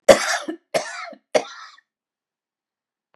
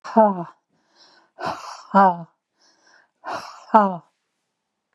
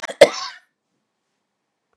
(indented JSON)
{
  "three_cough_length": "3.2 s",
  "three_cough_amplitude": 32768,
  "three_cough_signal_mean_std_ratio": 0.27,
  "exhalation_length": "4.9 s",
  "exhalation_amplitude": 32133,
  "exhalation_signal_mean_std_ratio": 0.32,
  "cough_length": "2.0 s",
  "cough_amplitude": 32768,
  "cough_signal_mean_std_ratio": 0.19,
  "survey_phase": "beta (2021-08-13 to 2022-03-07)",
  "age": "45-64",
  "gender": "Female",
  "wearing_mask": "No",
  "symptom_sore_throat": true,
  "symptom_fatigue": true,
  "symptom_headache": true,
  "symptom_onset": "6 days",
  "smoker_status": "Ex-smoker",
  "respiratory_condition_asthma": false,
  "respiratory_condition_other": false,
  "recruitment_source": "REACT",
  "submission_delay": "1 day",
  "covid_test_result": "Negative",
  "covid_test_method": "RT-qPCR"
}